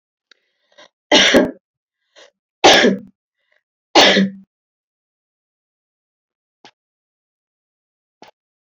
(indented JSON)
{
  "three_cough_length": "8.7 s",
  "three_cough_amplitude": 32768,
  "three_cough_signal_mean_std_ratio": 0.28,
  "survey_phase": "beta (2021-08-13 to 2022-03-07)",
  "age": "45-64",
  "gender": "Female",
  "wearing_mask": "No",
  "symptom_none": true,
  "smoker_status": "Never smoked",
  "respiratory_condition_asthma": false,
  "respiratory_condition_other": false,
  "recruitment_source": "REACT",
  "submission_delay": "1 day",
  "covid_test_result": "Negative",
  "covid_test_method": "RT-qPCR"
}